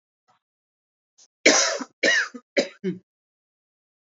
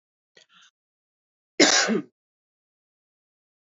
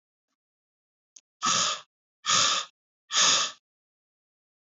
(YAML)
three_cough_length: 4.0 s
three_cough_amplitude: 27602
three_cough_signal_mean_std_ratio: 0.34
cough_length: 3.7 s
cough_amplitude: 25818
cough_signal_mean_std_ratio: 0.25
exhalation_length: 4.8 s
exhalation_amplitude: 11060
exhalation_signal_mean_std_ratio: 0.39
survey_phase: beta (2021-08-13 to 2022-03-07)
age: 18-44
gender: Male
wearing_mask: 'No'
symptom_new_continuous_cough: true
symptom_runny_or_blocked_nose: true
symptom_fever_high_temperature: true
symptom_headache: true
smoker_status: Never smoked
respiratory_condition_asthma: false
respiratory_condition_other: false
recruitment_source: Test and Trace
submission_delay: 3 days
covid_test_result: Positive
covid_test_method: RT-qPCR
covid_ct_value: 28.2
covid_ct_gene: ORF1ab gene
covid_ct_mean: 28.8
covid_viral_load: 370 copies/ml
covid_viral_load_category: Minimal viral load (< 10K copies/ml)